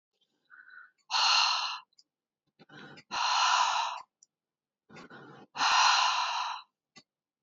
{"exhalation_length": "7.4 s", "exhalation_amplitude": 7979, "exhalation_signal_mean_std_ratio": 0.5, "survey_phase": "beta (2021-08-13 to 2022-03-07)", "age": "45-64", "gender": "Female", "wearing_mask": "No", "symptom_none": true, "smoker_status": "Current smoker (e-cigarettes or vapes only)", "respiratory_condition_asthma": true, "respiratory_condition_other": false, "recruitment_source": "REACT", "submission_delay": "3 days", "covid_test_result": "Negative", "covid_test_method": "RT-qPCR", "influenza_a_test_result": "Negative", "influenza_b_test_result": "Negative"}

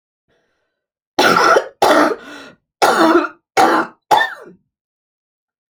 {"cough_length": "5.7 s", "cough_amplitude": 31307, "cough_signal_mean_std_ratio": 0.47, "survey_phase": "alpha (2021-03-01 to 2021-08-12)", "age": "45-64", "gender": "Female", "wearing_mask": "No", "symptom_none": true, "smoker_status": "Never smoked", "respiratory_condition_asthma": true, "respiratory_condition_other": false, "recruitment_source": "REACT", "submission_delay": "2 days", "covid_test_result": "Negative", "covid_test_method": "RT-qPCR"}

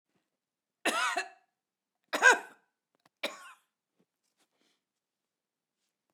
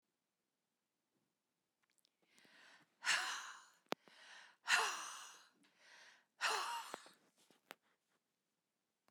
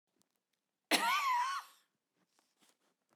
{"three_cough_length": "6.1 s", "three_cough_amplitude": 12704, "three_cough_signal_mean_std_ratio": 0.22, "exhalation_length": "9.1 s", "exhalation_amplitude": 3442, "exhalation_signal_mean_std_ratio": 0.31, "cough_length": "3.2 s", "cough_amplitude": 5857, "cough_signal_mean_std_ratio": 0.4, "survey_phase": "beta (2021-08-13 to 2022-03-07)", "age": "65+", "gender": "Female", "wearing_mask": "No", "symptom_none": true, "symptom_onset": "4 days", "smoker_status": "Ex-smoker", "respiratory_condition_asthma": false, "respiratory_condition_other": false, "recruitment_source": "REACT", "submission_delay": "2 days", "covid_test_result": "Negative", "covid_test_method": "RT-qPCR"}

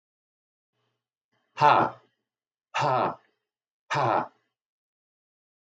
{"exhalation_length": "5.7 s", "exhalation_amplitude": 19340, "exhalation_signal_mean_std_ratio": 0.32, "survey_phase": "beta (2021-08-13 to 2022-03-07)", "age": "45-64", "gender": "Male", "wearing_mask": "No", "symptom_none": true, "smoker_status": "Never smoked", "respiratory_condition_asthma": false, "respiratory_condition_other": false, "recruitment_source": "REACT", "submission_delay": "1 day", "covid_test_result": "Negative", "covid_test_method": "RT-qPCR", "influenza_a_test_result": "Negative", "influenza_b_test_result": "Negative"}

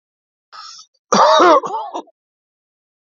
{"cough_length": "3.2 s", "cough_amplitude": 30419, "cough_signal_mean_std_ratio": 0.38, "survey_phase": "beta (2021-08-13 to 2022-03-07)", "age": "45-64", "gender": "Male", "wearing_mask": "No", "symptom_cough_any": true, "symptom_runny_or_blocked_nose": true, "symptom_onset": "12 days", "smoker_status": "Ex-smoker", "respiratory_condition_asthma": false, "respiratory_condition_other": false, "recruitment_source": "REACT", "submission_delay": "1 day", "covid_test_result": "Negative", "covid_test_method": "RT-qPCR", "influenza_a_test_result": "Negative", "influenza_b_test_result": "Negative"}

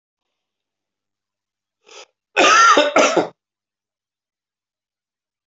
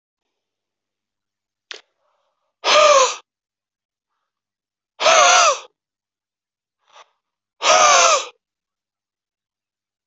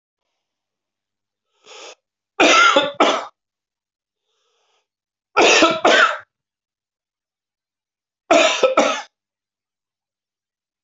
{"cough_length": "5.5 s", "cough_amplitude": 28712, "cough_signal_mean_std_ratio": 0.32, "exhalation_length": "10.1 s", "exhalation_amplitude": 29553, "exhalation_signal_mean_std_ratio": 0.33, "three_cough_length": "10.8 s", "three_cough_amplitude": 29032, "three_cough_signal_mean_std_ratio": 0.35, "survey_phase": "alpha (2021-03-01 to 2021-08-12)", "age": "45-64", "gender": "Male", "wearing_mask": "No", "symptom_cough_any": true, "symptom_fatigue": true, "symptom_fever_high_temperature": true, "symptom_change_to_sense_of_smell_or_taste": true, "symptom_onset": "5 days", "smoker_status": "Ex-smoker", "respiratory_condition_asthma": false, "respiratory_condition_other": false, "recruitment_source": "Test and Trace", "submission_delay": "2 days", "covid_test_result": "Positive", "covid_test_method": "RT-qPCR", "covid_ct_value": 19.7, "covid_ct_gene": "ORF1ab gene"}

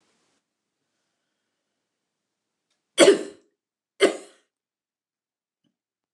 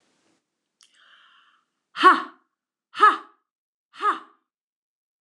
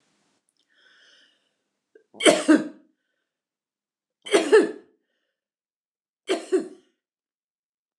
{"cough_length": "6.1 s", "cough_amplitude": 26049, "cough_signal_mean_std_ratio": 0.18, "exhalation_length": "5.2 s", "exhalation_amplitude": 23864, "exhalation_signal_mean_std_ratio": 0.24, "three_cough_length": "8.0 s", "three_cough_amplitude": 24228, "three_cough_signal_mean_std_ratio": 0.26, "survey_phase": "beta (2021-08-13 to 2022-03-07)", "age": "65+", "gender": "Female", "wearing_mask": "No", "symptom_none": true, "smoker_status": "Never smoked", "respiratory_condition_asthma": false, "respiratory_condition_other": false, "recruitment_source": "REACT", "submission_delay": "2 days", "covid_test_result": "Negative", "covid_test_method": "RT-qPCR", "influenza_a_test_result": "Negative", "influenza_b_test_result": "Negative"}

